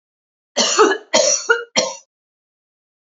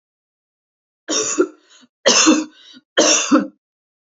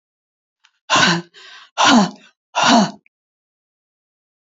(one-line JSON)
{"cough_length": "3.2 s", "cough_amplitude": 31109, "cough_signal_mean_std_ratio": 0.44, "three_cough_length": "4.2 s", "three_cough_amplitude": 30318, "three_cough_signal_mean_std_ratio": 0.43, "exhalation_length": "4.4 s", "exhalation_amplitude": 31934, "exhalation_signal_mean_std_ratio": 0.39, "survey_phase": "alpha (2021-03-01 to 2021-08-12)", "age": "65+", "gender": "Female", "wearing_mask": "No", "symptom_none": true, "symptom_onset": "2 days", "smoker_status": "Never smoked", "respiratory_condition_asthma": false, "respiratory_condition_other": false, "recruitment_source": "REACT", "submission_delay": "1 day", "covid_test_result": "Negative", "covid_test_method": "RT-qPCR"}